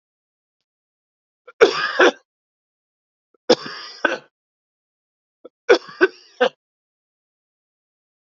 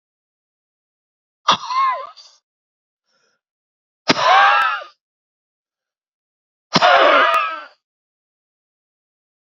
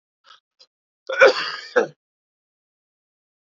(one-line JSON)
{"three_cough_length": "8.3 s", "three_cough_amplitude": 32767, "three_cough_signal_mean_std_ratio": 0.24, "exhalation_length": "9.5 s", "exhalation_amplitude": 29218, "exhalation_signal_mean_std_ratio": 0.36, "cough_length": "3.6 s", "cough_amplitude": 32767, "cough_signal_mean_std_ratio": 0.25, "survey_phase": "alpha (2021-03-01 to 2021-08-12)", "age": "45-64", "gender": "Male", "wearing_mask": "Yes", "symptom_cough_any": true, "symptom_shortness_of_breath": true, "symptom_fatigue": true, "symptom_fever_high_temperature": true, "symptom_headache": true, "symptom_onset": "5 days", "smoker_status": "Ex-smoker", "respiratory_condition_asthma": false, "respiratory_condition_other": false, "recruitment_source": "Test and Trace", "submission_delay": "2 days", "covid_test_result": "Positive", "covid_test_method": "RT-qPCR", "covid_ct_value": 16.1, "covid_ct_gene": "ORF1ab gene", "covid_ct_mean": 16.4, "covid_viral_load": "4200000 copies/ml", "covid_viral_load_category": "High viral load (>1M copies/ml)"}